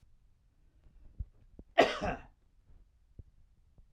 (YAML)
cough_length: 3.9 s
cough_amplitude: 10514
cough_signal_mean_std_ratio: 0.24
survey_phase: alpha (2021-03-01 to 2021-08-12)
age: 45-64
gender: Male
wearing_mask: 'No'
symptom_none: true
smoker_status: Never smoked
respiratory_condition_asthma: false
respiratory_condition_other: false
recruitment_source: REACT
submission_delay: 6 days
covid_test_result: Negative
covid_test_method: RT-qPCR